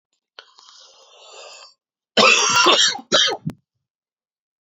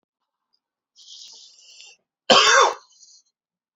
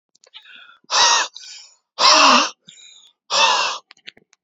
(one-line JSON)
{"three_cough_length": "4.6 s", "three_cough_amplitude": 29255, "three_cough_signal_mean_std_ratio": 0.41, "cough_length": "3.8 s", "cough_amplitude": 28991, "cough_signal_mean_std_ratio": 0.29, "exhalation_length": "4.4 s", "exhalation_amplitude": 29927, "exhalation_signal_mean_std_ratio": 0.46, "survey_phase": "alpha (2021-03-01 to 2021-08-12)", "age": "18-44", "gender": "Male", "wearing_mask": "No", "symptom_cough_any": true, "symptom_new_continuous_cough": true, "symptom_shortness_of_breath": true, "symptom_fatigue": true, "symptom_headache": true, "smoker_status": "Ex-smoker", "respiratory_condition_asthma": true, "respiratory_condition_other": false, "recruitment_source": "Test and Trace", "submission_delay": "2 days", "covid_test_result": "Positive", "covid_test_method": "LFT"}